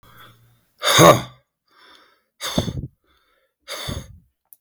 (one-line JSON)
{"exhalation_length": "4.6 s", "exhalation_amplitude": 32768, "exhalation_signal_mean_std_ratio": 0.29, "survey_phase": "beta (2021-08-13 to 2022-03-07)", "age": "65+", "gender": "Male", "wearing_mask": "No", "symptom_runny_or_blocked_nose": true, "symptom_other": true, "smoker_status": "Current smoker (1 to 10 cigarettes per day)", "respiratory_condition_asthma": false, "respiratory_condition_other": false, "recruitment_source": "REACT", "submission_delay": "3 days", "covid_test_result": "Negative", "covid_test_method": "RT-qPCR", "influenza_a_test_result": "Negative", "influenza_b_test_result": "Negative"}